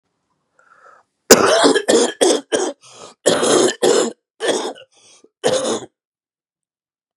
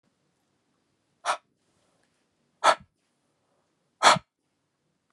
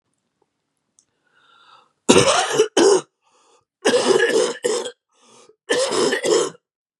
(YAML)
cough_length: 7.2 s
cough_amplitude: 32768
cough_signal_mean_std_ratio: 0.47
exhalation_length: 5.1 s
exhalation_amplitude: 23656
exhalation_signal_mean_std_ratio: 0.19
three_cough_length: 7.0 s
three_cough_amplitude: 32768
three_cough_signal_mean_std_ratio: 0.49
survey_phase: beta (2021-08-13 to 2022-03-07)
age: 18-44
gender: Male
wearing_mask: 'No'
symptom_cough_any: true
symptom_new_continuous_cough: true
symptom_change_to_sense_of_smell_or_taste: true
symptom_loss_of_taste: true
symptom_onset: 4 days
smoker_status: Never smoked
respiratory_condition_asthma: false
respiratory_condition_other: false
recruitment_source: Test and Trace
submission_delay: 2 days
covid_test_result: Positive
covid_test_method: RT-qPCR
covid_ct_value: 24.0
covid_ct_gene: ORF1ab gene